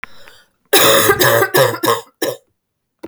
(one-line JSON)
{"three_cough_length": "3.1 s", "three_cough_amplitude": 32768, "three_cough_signal_mean_std_ratio": 0.55, "survey_phase": "beta (2021-08-13 to 2022-03-07)", "age": "18-44", "gender": "Female", "wearing_mask": "No", "symptom_cough_any": true, "symptom_runny_or_blocked_nose": true, "symptom_sore_throat": true, "symptom_onset": "4 days", "smoker_status": "Never smoked", "respiratory_condition_asthma": false, "respiratory_condition_other": false, "recruitment_source": "REACT", "submission_delay": "0 days", "covid_test_result": "Negative", "covid_test_method": "RT-qPCR"}